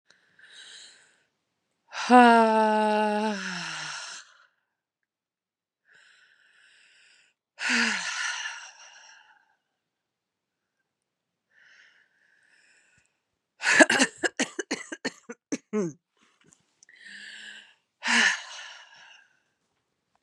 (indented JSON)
{
  "exhalation_length": "20.2 s",
  "exhalation_amplitude": 26109,
  "exhalation_signal_mean_std_ratio": 0.31,
  "survey_phase": "beta (2021-08-13 to 2022-03-07)",
  "age": "18-44",
  "gender": "Female",
  "wearing_mask": "No",
  "symptom_cough_any": true,
  "symptom_runny_or_blocked_nose": true,
  "symptom_sore_throat": true,
  "symptom_fatigue": true,
  "symptom_fever_high_temperature": true,
  "symptom_headache": true,
  "symptom_change_to_sense_of_smell_or_taste": true,
  "smoker_status": "Ex-smoker",
  "respiratory_condition_asthma": false,
  "respiratory_condition_other": false,
  "recruitment_source": "Test and Trace",
  "submission_delay": "2 days",
  "covid_test_result": "Positive",
  "covid_test_method": "RT-qPCR",
  "covid_ct_value": 23.3,
  "covid_ct_gene": "ORF1ab gene"
}